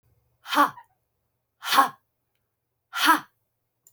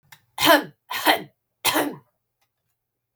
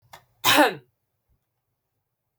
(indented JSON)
{
  "exhalation_length": "3.9 s",
  "exhalation_amplitude": 24391,
  "exhalation_signal_mean_std_ratio": 0.3,
  "three_cough_length": "3.2 s",
  "three_cough_amplitude": 26306,
  "three_cough_signal_mean_std_ratio": 0.36,
  "cough_length": "2.4 s",
  "cough_amplitude": 23150,
  "cough_signal_mean_std_ratio": 0.27,
  "survey_phase": "beta (2021-08-13 to 2022-03-07)",
  "age": "45-64",
  "gender": "Female",
  "wearing_mask": "No",
  "symptom_none": true,
  "smoker_status": "Never smoked",
  "respiratory_condition_asthma": false,
  "respiratory_condition_other": false,
  "recruitment_source": "REACT",
  "submission_delay": "1 day",
  "covid_test_result": "Negative",
  "covid_test_method": "RT-qPCR"
}